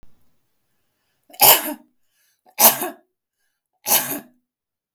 {
  "three_cough_length": "4.9 s",
  "three_cough_amplitude": 32768,
  "three_cough_signal_mean_std_ratio": 0.28,
  "survey_phase": "beta (2021-08-13 to 2022-03-07)",
  "age": "45-64",
  "gender": "Female",
  "wearing_mask": "No",
  "symptom_none": true,
  "smoker_status": "Never smoked",
  "respiratory_condition_asthma": false,
  "respiratory_condition_other": false,
  "recruitment_source": "REACT",
  "submission_delay": "1 day",
  "covid_test_result": "Negative",
  "covid_test_method": "RT-qPCR",
  "influenza_a_test_result": "Negative",
  "influenza_b_test_result": "Negative"
}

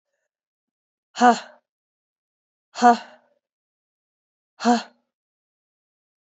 {
  "exhalation_length": "6.2 s",
  "exhalation_amplitude": 26908,
  "exhalation_signal_mean_std_ratio": 0.22,
  "survey_phase": "beta (2021-08-13 to 2022-03-07)",
  "age": "18-44",
  "gender": "Female",
  "wearing_mask": "No",
  "symptom_cough_any": true,
  "symptom_runny_or_blocked_nose": true,
  "symptom_headache": true,
  "symptom_onset": "3 days",
  "smoker_status": "Never smoked",
  "respiratory_condition_asthma": false,
  "respiratory_condition_other": false,
  "recruitment_source": "Test and Trace",
  "submission_delay": "2 days",
  "covid_test_result": "Positive",
  "covid_test_method": "RT-qPCR",
  "covid_ct_value": 15.9,
  "covid_ct_gene": "ORF1ab gene",
  "covid_ct_mean": 16.3,
  "covid_viral_load": "4400000 copies/ml",
  "covid_viral_load_category": "High viral load (>1M copies/ml)"
}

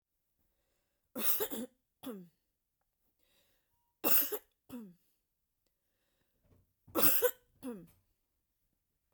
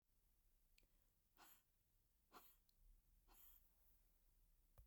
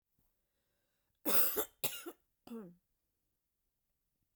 {
  "three_cough_length": "9.1 s",
  "three_cough_amplitude": 9413,
  "three_cough_signal_mean_std_ratio": 0.28,
  "exhalation_length": "4.9 s",
  "exhalation_amplitude": 91,
  "exhalation_signal_mean_std_ratio": 0.81,
  "cough_length": "4.4 s",
  "cough_amplitude": 7213,
  "cough_signal_mean_std_ratio": 0.27,
  "survey_phase": "beta (2021-08-13 to 2022-03-07)",
  "age": "45-64",
  "gender": "Female",
  "wearing_mask": "No",
  "symptom_runny_or_blocked_nose": true,
  "symptom_shortness_of_breath": true,
  "symptom_fatigue": true,
  "symptom_headache": true,
  "symptom_change_to_sense_of_smell_or_taste": true,
  "symptom_loss_of_taste": true,
  "symptom_other": true,
  "symptom_onset": "13 days",
  "smoker_status": "Never smoked",
  "respiratory_condition_asthma": false,
  "respiratory_condition_other": false,
  "recruitment_source": "REACT",
  "submission_delay": "1 day",
  "covid_test_result": "Negative",
  "covid_test_method": "RT-qPCR",
  "influenza_a_test_result": "Unknown/Void",
  "influenza_b_test_result": "Unknown/Void"
}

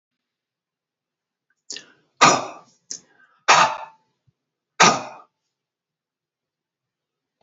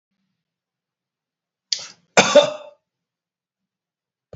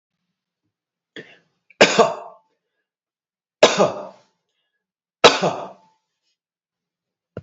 {
  "exhalation_length": "7.4 s",
  "exhalation_amplitude": 32768,
  "exhalation_signal_mean_std_ratio": 0.24,
  "cough_length": "4.4 s",
  "cough_amplitude": 31234,
  "cough_signal_mean_std_ratio": 0.21,
  "three_cough_length": "7.4 s",
  "three_cough_amplitude": 32768,
  "three_cough_signal_mean_std_ratio": 0.25,
  "survey_phase": "beta (2021-08-13 to 2022-03-07)",
  "age": "45-64",
  "gender": "Male",
  "wearing_mask": "No",
  "symptom_none": true,
  "smoker_status": "Never smoked",
  "respiratory_condition_asthma": false,
  "respiratory_condition_other": false,
  "recruitment_source": "REACT",
  "submission_delay": "33 days",
  "covid_test_result": "Negative",
  "covid_test_method": "RT-qPCR",
  "influenza_a_test_result": "Negative",
  "influenza_b_test_result": "Negative"
}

